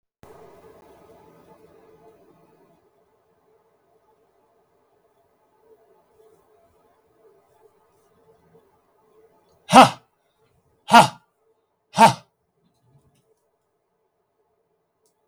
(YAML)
exhalation_length: 15.3 s
exhalation_amplitude: 32768
exhalation_signal_mean_std_ratio: 0.15
survey_phase: beta (2021-08-13 to 2022-03-07)
age: 65+
gender: Male
wearing_mask: 'No'
symptom_none: true
smoker_status: Never smoked
respiratory_condition_asthma: true
respiratory_condition_other: true
recruitment_source: REACT
submission_delay: 0 days
covid_test_result: Negative
covid_test_method: RT-qPCR
influenza_a_test_result: Negative
influenza_b_test_result: Negative